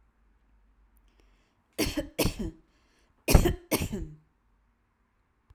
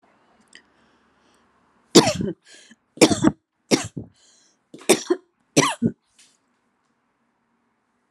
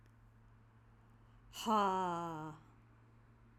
{"cough_length": "5.5 s", "cough_amplitude": 24658, "cough_signal_mean_std_ratio": 0.29, "three_cough_length": "8.1 s", "three_cough_amplitude": 32767, "three_cough_signal_mean_std_ratio": 0.26, "exhalation_length": "3.6 s", "exhalation_amplitude": 2655, "exhalation_signal_mean_std_ratio": 0.43, "survey_phase": "alpha (2021-03-01 to 2021-08-12)", "age": "45-64", "gender": "Female", "wearing_mask": "No", "symptom_none": true, "smoker_status": "Never smoked", "respiratory_condition_asthma": false, "respiratory_condition_other": false, "recruitment_source": "REACT", "submission_delay": "3 days", "covid_test_result": "Negative", "covid_test_method": "RT-qPCR"}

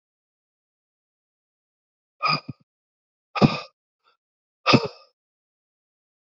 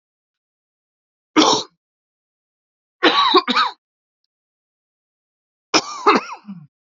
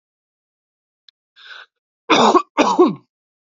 {"exhalation_length": "6.3 s", "exhalation_amplitude": 27322, "exhalation_signal_mean_std_ratio": 0.21, "three_cough_length": "7.0 s", "three_cough_amplitude": 32373, "three_cough_signal_mean_std_ratio": 0.32, "cough_length": "3.6 s", "cough_amplitude": 29727, "cough_signal_mean_std_ratio": 0.34, "survey_phase": "beta (2021-08-13 to 2022-03-07)", "age": "18-44", "gender": "Male", "wearing_mask": "No", "symptom_cough_any": true, "symptom_new_continuous_cough": true, "symptom_shortness_of_breath": true, "symptom_sore_throat": true, "symptom_abdominal_pain": true, "symptom_fatigue": true, "symptom_onset": "4 days", "smoker_status": "Ex-smoker", "respiratory_condition_asthma": false, "respiratory_condition_other": false, "recruitment_source": "Test and Trace", "submission_delay": "2 days", "covid_test_result": "Positive", "covid_test_method": "RT-qPCR", "covid_ct_value": 13.9, "covid_ct_gene": "ORF1ab gene", "covid_ct_mean": 14.4, "covid_viral_load": "19000000 copies/ml", "covid_viral_load_category": "High viral load (>1M copies/ml)"}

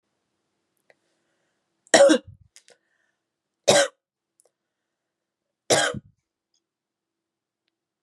{"three_cough_length": "8.0 s", "three_cough_amplitude": 31676, "three_cough_signal_mean_std_ratio": 0.22, "survey_phase": "beta (2021-08-13 to 2022-03-07)", "age": "18-44", "gender": "Female", "wearing_mask": "No", "symptom_change_to_sense_of_smell_or_taste": true, "smoker_status": "Ex-smoker", "respiratory_condition_asthma": false, "respiratory_condition_other": false, "recruitment_source": "REACT", "submission_delay": "1 day", "covid_test_result": "Negative", "covid_test_method": "RT-qPCR", "influenza_a_test_result": "Negative", "influenza_b_test_result": "Negative"}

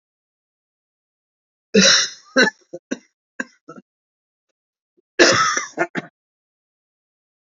{"cough_length": "7.5 s", "cough_amplitude": 29063, "cough_signal_mean_std_ratio": 0.3, "survey_phase": "alpha (2021-03-01 to 2021-08-12)", "age": "45-64", "gender": "Male", "wearing_mask": "No", "symptom_cough_any": true, "symptom_headache": true, "symptom_change_to_sense_of_smell_or_taste": true, "symptom_loss_of_taste": true, "symptom_onset": "4 days", "smoker_status": "Never smoked", "respiratory_condition_asthma": false, "respiratory_condition_other": false, "recruitment_source": "Test and Trace", "submission_delay": "2 days", "covid_test_result": "Positive", "covid_test_method": "RT-qPCR", "covid_ct_value": 14.2, "covid_ct_gene": "ORF1ab gene", "covid_ct_mean": 14.9, "covid_viral_load": "13000000 copies/ml", "covid_viral_load_category": "High viral load (>1M copies/ml)"}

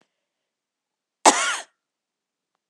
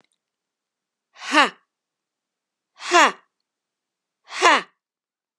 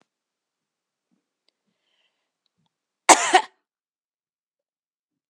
{"cough_length": "2.7 s", "cough_amplitude": 32748, "cough_signal_mean_std_ratio": 0.22, "exhalation_length": "5.4 s", "exhalation_amplitude": 32767, "exhalation_signal_mean_std_ratio": 0.24, "three_cough_length": "5.3 s", "three_cough_amplitude": 32768, "three_cough_signal_mean_std_ratio": 0.15, "survey_phase": "beta (2021-08-13 to 2022-03-07)", "age": "45-64", "gender": "Female", "wearing_mask": "No", "symptom_none": true, "smoker_status": "Never smoked", "respiratory_condition_asthma": false, "respiratory_condition_other": false, "recruitment_source": "REACT", "submission_delay": "2 days", "covid_test_result": "Negative", "covid_test_method": "RT-qPCR"}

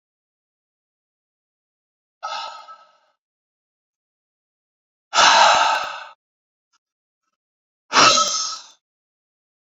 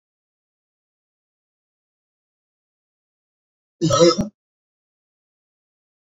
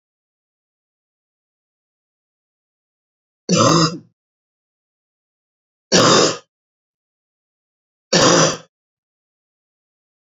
{"exhalation_length": "9.6 s", "exhalation_amplitude": 32217, "exhalation_signal_mean_std_ratio": 0.3, "cough_length": "6.1 s", "cough_amplitude": 26896, "cough_signal_mean_std_ratio": 0.2, "three_cough_length": "10.3 s", "three_cough_amplitude": 32494, "three_cough_signal_mean_std_ratio": 0.28, "survey_phase": "beta (2021-08-13 to 2022-03-07)", "age": "45-64", "gender": "Male", "wearing_mask": "No", "symptom_cough_any": true, "symptom_runny_or_blocked_nose": true, "symptom_sore_throat": true, "smoker_status": "Never smoked", "respiratory_condition_asthma": false, "respiratory_condition_other": false, "recruitment_source": "REACT", "submission_delay": "0 days", "covid_test_result": "Positive", "covid_test_method": "RT-qPCR", "covid_ct_value": 17.0, "covid_ct_gene": "E gene", "influenza_a_test_result": "Negative", "influenza_b_test_result": "Negative"}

